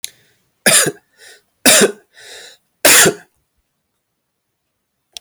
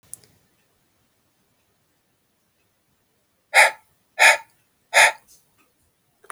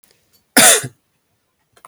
{"three_cough_length": "5.2 s", "three_cough_amplitude": 32768, "three_cough_signal_mean_std_ratio": 0.34, "exhalation_length": "6.3 s", "exhalation_amplitude": 31002, "exhalation_signal_mean_std_ratio": 0.22, "cough_length": "1.9 s", "cough_amplitude": 32768, "cough_signal_mean_std_ratio": 0.31, "survey_phase": "alpha (2021-03-01 to 2021-08-12)", "age": "45-64", "gender": "Male", "wearing_mask": "No", "symptom_none": true, "symptom_onset": "6 days", "smoker_status": "Ex-smoker", "respiratory_condition_asthma": false, "respiratory_condition_other": false, "recruitment_source": "REACT", "submission_delay": "1 day", "covid_test_result": "Negative", "covid_test_method": "RT-qPCR"}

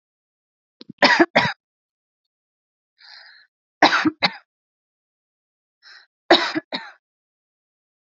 {"three_cough_length": "8.1 s", "three_cough_amplitude": 30071, "three_cough_signal_mean_std_ratio": 0.26, "survey_phase": "alpha (2021-03-01 to 2021-08-12)", "age": "18-44", "gender": "Female", "wearing_mask": "No", "symptom_none": true, "smoker_status": "Ex-smoker", "respiratory_condition_asthma": false, "respiratory_condition_other": false, "recruitment_source": "REACT", "submission_delay": "1 day", "covid_test_result": "Negative", "covid_test_method": "RT-qPCR"}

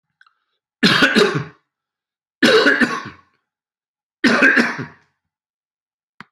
{"three_cough_length": "6.3 s", "three_cough_amplitude": 32032, "three_cough_signal_mean_std_ratio": 0.42, "survey_phase": "beta (2021-08-13 to 2022-03-07)", "age": "65+", "gender": "Male", "wearing_mask": "No", "symptom_none": true, "smoker_status": "Never smoked", "respiratory_condition_asthma": false, "respiratory_condition_other": true, "recruitment_source": "REACT", "submission_delay": "3 days", "covid_test_result": "Negative", "covid_test_method": "RT-qPCR", "influenza_a_test_result": "Negative", "influenza_b_test_result": "Negative"}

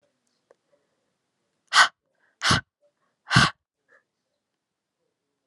{"exhalation_length": "5.5 s", "exhalation_amplitude": 23142, "exhalation_signal_mean_std_ratio": 0.23, "survey_phase": "alpha (2021-03-01 to 2021-08-12)", "age": "18-44", "gender": "Female", "wearing_mask": "No", "symptom_new_continuous_cough": true, "symptom_fatigue": true, "symptom_headache": true, "symptom_change_to_sense_of_smell_or_taste": true, "smoker_status": "Never smoked", "respiratory_condition_asthma": false, "respiratory_condition_other": false, "recruitment_source": "Test and Trace", "submission_delay": "1 day", "covid_test_result": "Positive", "covid_test_method": "RT-qPCR"}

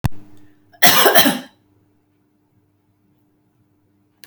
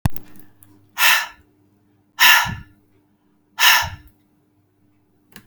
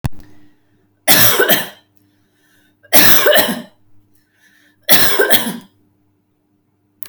{"cough_length": "4.3 s", "cough_amplitude": 32768, "cough_signal_mean_std_ratio": 0.32, "exhalation_length": "5.5 s", "exhalation_amplitude": 32768, "exhalation_signal_mean_std_ratio": 0.35, "three_cough_length": "7.1 s", "three_cough_amplitude": 32768, "three_cough_signal_mean_std_ratio": 0.42, "survey_phase": "beta (2021-08-13 to 2022-03-07)", "age": "45-64", "gender": "Female", "wearing_mask": "No", "symptom_none": true, "smoker_status": "Ex-smoker", "respiratory_condition_asthma": false, "respiratory_condition_other": false, "recruitment_source": "REACT", "submission_delay": "1 day", "covid_test_result": "Negative", "covid_test_method": "RT-qPCR"}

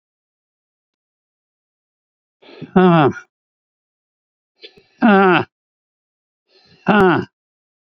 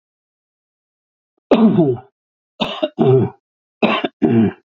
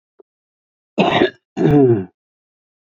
{"exhalation_length": "7.9 s", "exhalation_amplitude": 28556, "exhalation_signal_mean_std_ratio": 0.32, "three_cough_length": "4.7 s", "three_cough_amplitude": 27821, "three_cough_signal_mean_std_ratio": 0.46, "cough_length": "2.8 s", "cough_amplitude": 27320, "cough_signal_mean_std_ratio": 0.44, "survey_phase": "beta (2021-08-13 to 2022-03-07)", "age": "65+", "gender": "Male", "wearing_mask": "No", "symptom_none": true, "smoker_status": "Ex-smoker", "respiratory_condition_asthma": true, "respiratory_condition_other": true, "recruitment_source": "REACT", "submission_delay": "1 day", "covid_test_result": "Negative", "covid_test_method": "RT-qPCR", "influenza_a_test_result": "Negative", "influenza_b_test_result": "Negative"}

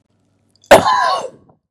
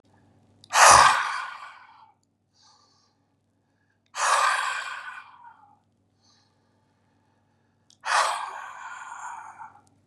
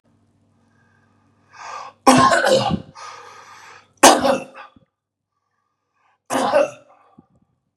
{"cough_length": "1.7 s", "cough_amplitude": 32768, "cough_signal_mean_std_ratio": 0.41, "exhalation_length": "10.1 s", "exhalation_amplitude": 31751, "exhalation_signal_mean_std_ratio": 0.32, "three_cough_length": "7.8 s", "three_cough_amplitude": 32768, "three_cough_signal_mean_std_ratio": 0.35, "survey_phase": "beta (2021-08-13 to 2022-03-07)", "age": "45-64", "gender": "Male", "wearing_mask": "No", "symptom_none": true, "smoker_status": "Ex-smoker", "respiratory_condition_asthma": false, "respiratory_condition_other": false, "recruitment_source": "REACT", "submission_delay": "6 days", "covid_test_result": "Negative", "covid_test_method": "RT-qPCR", "influenza_a_test_result": "Negative", "influenza_b_test_result": "Negative"}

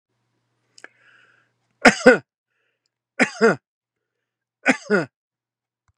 {"three_cough_length": "6.0 s", "three_cough_amplitude": 32767, "three_cough_signal_mean_std_ratio": 0.24, "survey_phase": "beta (2021-08-13 to 2022-03-07)", "age": "65+", "gender": "Male", "wearing_mask": "No", "symptom_none": true, "smoker_status": "Never smoked", "respiratory_condition_asthma": false, "respiratory_condition_other": false, "recruitment_source": "REACT", "submission_delay": "1 day", "covid_test_result": "Negative", "covid_test_method": "RT-qPCR", "influenza_a_test_result": "Negative", "influenza_b_test_result": "Negative"}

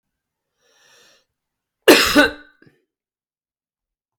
{"cough_length": "4.2 s", "cough_amplitude": 32768, "cough_signal_mean_std_ratio": 0.23, "survey_phase": "beta (2021-08-13 to 2022-03-07)", "age": "18-44", "gender": "Male", "wearing_mask": "No", "symptom_new_continuous_cough": true, "symptom_runny_or_blocked_nose": true, "symptom_sore_throat": true, "symptom_fatigue": true, "symptom_headache": true, "symptom_onset": "3 days", "smoker_status": "Never smoked", "respiratory_condition_asthma": false, "respiratory_condition_other": false, "recruitment_source": "Test and Trace", "submission_delay": "2 days", "covid_test_result": "Positive", "covid_test_method": "RT-qPCR", "covid_ct_value": 21.0, "covid_ct_gene": "ORF1ab gene", "covid_ct_mean": 21.6, "covid_viral_load": "79000 copies/ml", "covid_viral_load_category": "Low viral load (10K-1M copies/ml)"}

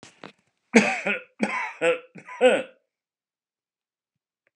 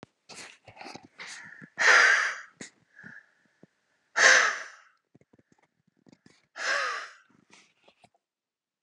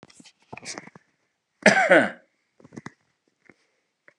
{"three_cough_length": "4.6 s", "three_cough_amplitude": 27812, "three_cough_signal_mean_std_ratio": 0.35, "exhalation_length": "8.8 s", "exhalation_amplitude": 18305, "exhalation_signal_mean_std_ratio": 0.32, "cough_length": "4.2 s", "cough_amplitude": 32151, "cough_signal_mean_std_ratio": 0.26, "survey_phase": "beta (2021-08-13 to 2022-03-07)", "age": "65+", "gender": "Male", "wearing_mask": "No", "symptom_none": true, "smoker_status": "Ex-smoker", "respiratory_condition_asthma": false, "respiratory_condition_other": false, "recruitment_source": "REACT", "submission_delay": "1 day", "covid_test_result": "Negative", "covid_test_method": "RT-qPCR"}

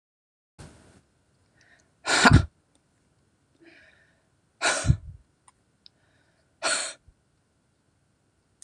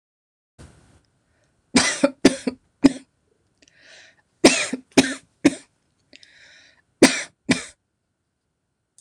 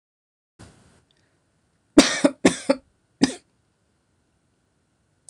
{"exhalation_length": "8.6 s", "exhalation_amplitude": 26027, "exhalation_signal_mean_std_ratio": 0.23, "three_cough_length": "9.0 s", "three_cough_amplitude": 26028, "three_cough_signal_mean_std_ratio": 0.26, "cough_length": "5.3 s", "cough_amplitude": 26028, "cough_signal_mean_std_ratio": 0.21, "survey_phase": "beta (2021-08-13 to 2022-03-07)", "age": "45-64", "gender": "Female", "wearing_mask": "No", "symptom_none": true, "symptom_onset": "7 days", "smoker_status": "Never smoked", "respiratory_condition_asthma": false, "respiratory_condition_other": false, "recruitment_source": "REACT", "submission_delay": "2 days", "covid_test_result": "Negative", "covid_test_method": "RT-qPCR"}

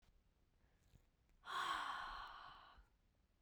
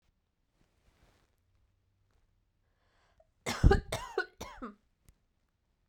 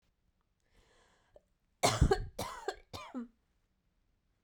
{"exhalation_length": "3.4 s", "exhalation_amplitude": 946, "exhalation_signal_mean_std_ratio": 0.49, "cough_length": "5.9 s", "cough_amplitude": 10820, "cough_signal_mean_std_ratio": 0.2, "three_cough_length": "4.4 s", "three_cough_amplitude": 7038, "three_cough_signal_mean_std_ratio": 0.28, "survey_phase": "beta (2021-08-13 to 2022-03-07)", "age": "18-44", "gender": "Female", "wearing_mask": "No", "symptom_cough_any": true, "symptom_runny_or_blocked_nose": true, "symptom_sore_throat": true, "symptom_fatigue": true, "symptom_headache": true, "smoker_status": "Ex-smoker", "respiratory_condition_asthma": false, "respiratory_condition_other": false, "recruitment_source": "REACT", "submission_delay": "10 days", "covid_test_result": "Negative", "covid_test_method": "RT-qPCR"}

